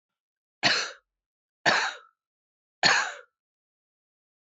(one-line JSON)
{"three_cough_length": "4.5 s", "three_cough_amplitude": 17973, "three_cough_signal_mean_std_ratio": 0.32, "survey_phase": "beta (2021-08-13 to 2022-03-07)", "age": "45-64", "gender": "Female", "wearing_mask": "No", "symptom_cough_any": true, "symptom_runny_or_blocked_nose": true, "symptom_sore_throat": true, "symptom_headache": true, "symptom_change_to_sense_of_smell_or_taste": true, "symptom_loss_of_taste": true, "smoker_status": "Never smoked", "respiratory_condition_asthma": false, "respiratory_condition_other": false, "recruitment_source": "Test and Trace", "submission_delay": "1 day", "covid_test_result": "Positive", "covid_test_method": "RT-qPCR", "covid_ct_value": 16.5, "covid_ct_gene": "ORF1ab gene", "covid_ct_mean": 16.7, "covid_viral_load": "3200000 copies/ml", "covid_viral_load_category": "High viral load (>1M copies/ml)"}